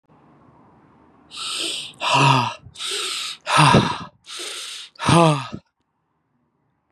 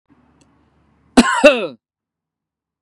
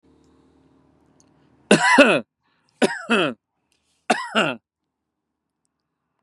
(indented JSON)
{
  "exhalation_length": "6.9 s",
  "exhalation_amplitude": 30342,
  "exhalation_signal_mean_std_ratio": 0.45,
  "cough_length": "2.8 s",
  "cough_amplitude": 32768,
  "cough_signal_mean_std_ratio": 0.28,
  "three_cough_length": "6.2 s",
  "three_cough_amplitude": 32767,
  "three_cough_signal_mean_std_ratio": 0.32,
  "survey_phase": "beta (2021-08-13 to 2022-03-07)",
  "age": "18-44",
  "gender": "Male",
  "wearing_mask": "No",
  "symptom_none": true,
  "smoker_status": "Never smoked",
  "respiratory_condition_asthma": false,
  "respiratory_condition_other": false,
  "recruitment_source": "REACT",
  "submission_delay": "0 days",
  "covid_test_result": "Negative",
  "covid_test_method": "RT-qPCR",
  "influenza_a_test_result": "Unknown/Void",
  "influenza_b_test_result": "Unknown/Void"
}